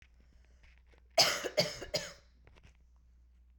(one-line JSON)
{"three_cough_length": "3.6 s", "three_cough_amplitude": 9208, "three_cough_signal_mean_std_ratio": 0.33, "survey_phase": "beta (2021-08-13 to 2022-03-07)", "age": "18-44", "gender": "Female", "wearing_mask": "No", "symptom_cough_any": true, "symptom_runny_or_blocked_nose": true, "symptom_shortness_of_breath": true, "symptom_sore_throat": true, "symptom_fatigue": true, "symptom_headache": true, "symptom_change_to_sense_of_smell_or_taste": true, "symptom_onset": "5 days", "smoker_status": "Current smoker (1 to 10 cigarettes per day)", "respiratory_condition_asthma": false, "respiratory_condition_other": false, "recruitment_source": "Test and Trace", "submission_delay": "2 days", "covid_test_result": "Positive", "covid_test_method": "RT-qPCR", "covid_ct_value": 24.6, "covid_ct_gene": "ORF1ab gene", "covid_ct_mean": 25.1, "covid_viral_load": "5700 copies/ml", "covid_viral_load_category": "Minimal viral load (< 10K copies/ml)"}